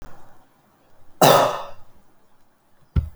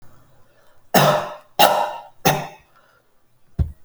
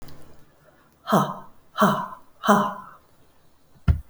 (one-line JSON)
{"cough_length": "3.2 s", "cough_amplitude": 32767, "cough_signal_mean_std_ratio": 0.35, "three_cough_length": "3.8 s", "three_cough_amplitude": 32768, "three_cough_signal_mean_std_ratio": 0.4, "exhalation_length": "4.1 s", "exhalation_amplitude": 27091, "exhalation_signal_mean_std_ratio": 0.4, "survey_phase": "alpha (2021-03-01 to 2021-08-12)", "age": "65+", "gender": "Female", "wearing_mask": "No", "symptom_none": true, "smoker_status": "Never smoked", "respiratory_condition_asthma": false, "respiratory_condition_other": false, "recruitment_source": "REACT", "submission_delay": "2 days", "covid_test_result": "Negative", "covid_test_method": "RT-qPCR"}